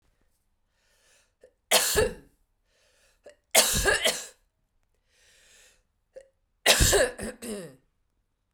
{"three_cough_length": "8.5 s", "three_cough_amplitude": 22388, "three_cough_signal_mean_std_ratio": 0.35, "survey_phase": "beta (2021-08-13 to 2022-03-07)", "age": "18-44", "gender": "Female", "wearing_mask": "No", "symptom_cough_any": true, "symptom_runny_or_blocked_nose": true, "symptom_shortness_of_breath": true, "symptom_fatigue": true, "symptom_headache": true, "symptom_change_to_sense_of_smell_or_taste": true, "symptom_onset": "3 days", "smoker_status": "Never smoked", "respiratory_condition_asthma": false, "respiratory_condition_other": false, "recruitment_source": "Test and Trace", "submission_delay": "2 days", "covid_test_result": "Positive", "covid_test_method": "RT-qPCR"}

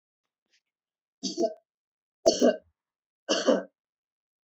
{"three_cough_length": "4.4 s", "three_cough_amplitude": 14183, "three_cough_signal_mean_std_ratio": 0.3, "survey_phase": "beta (2021-08-13 to 2022-03-07)", "age": "45-64", "gender": "Female", "wearing_mask": "No", "symptom_none": true, "smoker_status": "Never smoked", "respiratory_condition_asthma": false, "respiratory_condition_other": false, "recruitment_source": "REACT", "submission_delay": "2 days", "covid_test_result": "Negative", "covid_test_method": "RT-qPCR", "influenza_a_test_result": "Negative", "influenza_b_test_result": "Negative"}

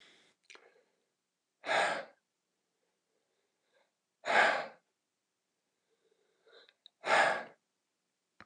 {"exhalation_length": "8.5 s", "exhalation_amplitude": 6281, "exhalation_signal_mean_std_ratio": 0.28, "survey_phase": "beta (2021-08-13 to 2022-03-07)", "age": "45-64", "gender": "Male", "wearing_mask": "No", "symptom_none": true, "smoker_status": "Ex-smoker", "respiratory_condition_asthma": false, "respiratory_condition_other": false, "recruitment_source": "REACT", "submission_delay": "1 day", "covid_test_result": "Negative", "covid_test_method": "RT-qPCR", "influenza_a_test_result": "Negative", "influenza_b_test_result": "Negative"}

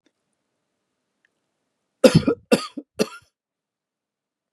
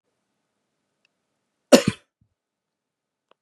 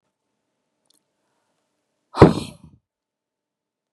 {"three_cough_length": "4.5 s", "three_cough_amplitude": 32768, "three_cough_signal_mean_std_ratio": 0.2, "cough_length": "3.4 s", "cough_amplitude": 32768, "cough_signal_mean_std_ratio": 0.13, "exhalation_length": "3.9 s", "exhalation_amplitude": 32768, "exhalation_signal_mean_std_ratio": 0.15, "survey_phase": "beta (2021-08-13 to 2022-03-07)", "age": "45-64", "gender": "Male", "wearing_mask": "No", "symptom_none": true, "smoker_status": "Ex-smoker", "respiratory_condition_asthma": false, "respiratory_condition_other": false, "recruitment_source": "REACT", "submission_delay": "3 days", "covid_test_result": "Negative", "covid_test_method": "RT-qPCR", "influenza_a_test_result": "Negative", "influenza_b_test_result": "Negative"}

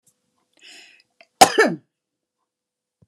{"cough_length": "3.1 s", "cough_amplitude": 32768, "cough_signal_mean_std_ratio": 0.2, "survey_phase": "beta (2021-08-13 to 2022-03-07)", "age": "45-64", "gender": "Female", "wearing_mask": "Yes", "symptom_diarrhoea": true, "symptom_fatigue": true, "symptom_onset": "6 days", "smoker_status": "Ex-smoker", "respiratory_condition_asthma": false, "respiratory_condition_other": false, "recruitment_source": "REACT", "submission_delay": "1 day", "covid_test_result": "Negative", "covid_test_method": "RT-qPCR", "influenza_a_test_result": "Negative", "influenza_b_test_result": "Negative"}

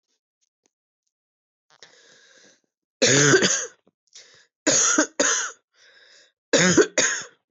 {"cough_length": "7.5 s", "cough_amplitude": 18310, "cough_signal_mean_std_ratio": 0.4, "survey_phase": "beta (2021-08-13 to 2022-03-07)", "age": "18-44", "gender": "Female", "wearing_mask": "No", "symptom_cough_any": true, "symptom_runny_or_blocked_nose": true, "symptom_sore_throat": true, "symptom_fatigue": true, "symptom_headache": true, "symptom_change_to_sense_of_smell_or_taste": true, "smoker_status": "Never smoked", "respiratory_condition_asthma": false, "respiratory_condition_other": false, "recruitment_source": "Test and Trace", "submission_delay": "2 days", "covid_test_result": "Positive", "covid_test_method": "ePCR"}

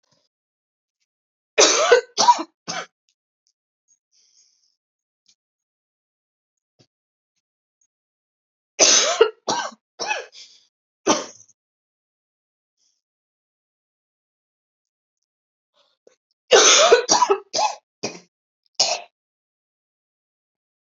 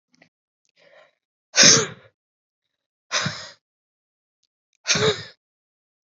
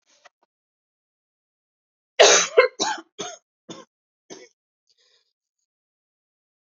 {"three_cough_length": "20.8 s", "three_cough_amplitude": 32768, "three_cough_signal_mean_std_ratio": 0.27, "exhalation_length": "6.1 s", "exhalation_amplitude": 32767, "exhalation_signal_mean_std_ratio": 0.26, "cough_length": "6.7 s", "cough_amplitude": 29652, "cough_signal_mean_std_ratio": 0.22, "survey_phase": "beta (2021-08-13 to 2022-03-07)", "age": "18-44", "gender": "Female", "wearing_mask": "No", "symptom_cough_any": true, "symptom_new_continuous_cough": true, "symptom_runny_or_blocked_nose": true, "symptom_sore_throat": true, "symptom_fatigue": true, "symptom_fever_high_temperature": true, "symptom_headache": true, "symptom_other": true, "smoker_status": "Never smoked", "respiratory_condition_asthma": true, "respiratory_condition_other": false, "recruitment_source": "Test and Trace", "submission_delay": "2 days", "covid_test_result": "Positive", "covid_test_method": "RT-qPCR", "covid_ct_value": 12.2, "covid_ct_gene": "ORF1ab gene", "covid_ct_mean": 12.9, "covid_viral_load": "60000000 copies/ml", "covid_viral_load_category": "High viral load (>1M copies/ml)"}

